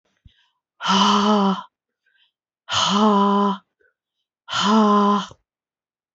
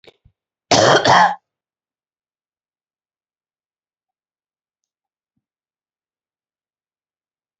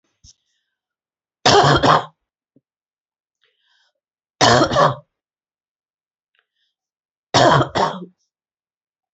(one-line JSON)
{"exhalation_length": "6.1 s", "exhalation_amplitude": 20311, "exhalation_signal_mean_std_ratio": 0.56, "cough_length": "7.6 s", "cough_amplitude": 31670, "cough_signal_mean_std_ratio": 0.22, "three_cough_length": "9.1 s", "three_cough_amplitude": 32767, "three_cough_signal_mean_std_ratio": 0.33, "survey_phase": "beta (2021-08-13 to 2022-03-07)", "age": "45-64", "gender": "Female", "wearing_mask": "No", "symptom_cough_any": true, "symptom_runny_or_blocked_nose": true, "symptom_sore_throat": true, "symptom_fatigue": true, "symptom_fever_high_temperature": true, "symptom_headache": true, "symptom_onset": "3 days", "smoker_status": "Never smoked", "respiratory_condition_asthma": false, "respiratory_condition_other": false, "recruitment_source": "Test and Trace", "submission_delay": "2 days", "covid_test_result": "Positive", "covid_test_method": "RT-qPCR", "covid_ct_value": 17.3, "covid_ct_gene": "ORF1ab gene"}